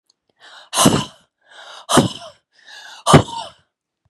{"exhalation_length": "4.1 s", "exhalation_amplitude": 32768, "exhalation_signal_mean_std_ratio": 0.33, "survey_phase": "beta (2021-08-13 to 2022-03-07)", "age": "18-44", "gender": "Female", "wearing_mask": "No", "symptom_cough_any": true, "symptom_runny_or_blocked_nose": true, "symptom_shortness_of_breath": true, "symptom_sore_throat": true, "symptom_fatigue": true, "symptom_headache": true, "symptom_onset": "3 days", "smoker_status": "Ex-smoker", "respiratory_condition_asthma": true, "respiratory_condition_other": false, "recruitment_source": "Test and Trace", "submission_delay": "1 day", "covid_test_result": "Positive", "covid_test_method": "RT-qPCR", "covid_ct_value": 16.5, "covid_ct_gene": "ORF1ab gene", "covid_ct_mean": 16.8, "covid_viral_load": "3100000 copies/ml", "covid_viral_load_category": "High viral load (>1M copies/ml)"}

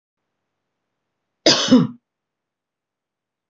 {"cough_length": "3.5 s", "cough_amplitude": 26531, "cough_signal_mean_std_ratio": 0.25, "survey_phase": "beta (2021-08-13 to 2022-03-07)", "age": "45-64", "gender": "Female", "wearing_mask": "No", "symptom_none": true, "smoker_status": "Never smoked", "respiratory_condition_asthma": false, "respiratory_condition_other": false, "recruitment_source": "REACT", "submission_delay": "1 day", "covid_test_result": "Negative", "covid_test_method": "RT-qPCR", "influenza_a_test_result": "Negative", "influenza_b_test_result": "Negative"}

